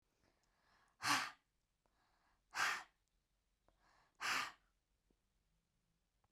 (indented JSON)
{
  "exhalation_length": "6.3 s",
  "exhalation_amplitude": 2436,
  "exhalation_signal_mean_std_ratio": 0.29,
  "survey_phase": "beta (2021-08-13 to 2022-03-07)",
  "age": "45-64",
  "gender": "Female",
  "wearing_mask": "No",
  "symptom_headache": true,
  "symptom_onset": "4 days",
  "smoker_status": "Never smoked",
  "respiratory_condition_asthma": false,
  "respiratory_condition_other": false,
  "recruitment_source": "REACT",
  "submission_delay": "3 days",
  "covid_test_result": "Negative",
  "covid_test_method": "RT-qPCR",
  "influenza_a_test_result": "Negative",
  "influenza_b_test_result": "Negative"
}